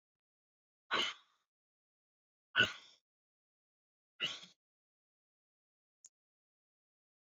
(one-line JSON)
{"exhalation_length": "7.3 s", "exhalation_amplitude": 6190, "exhalation_signal_mean_std_ratio": 0.19, "survey_phase": "beta (2021-08-13 to 2022-03-07)", "age": "45-64", "gender": "Female", "wearing_mask": "No", "symptom_cough_any": true, "smoker_status": "Ex-smoker", "respiratory_condition_asthma": false, "respiratory_condition_other": false, "recruitment_source": "REACT", "submission_delay": "1 day", "covid_test_result": "Negative", "covid_test_method": "RT-qPCR"}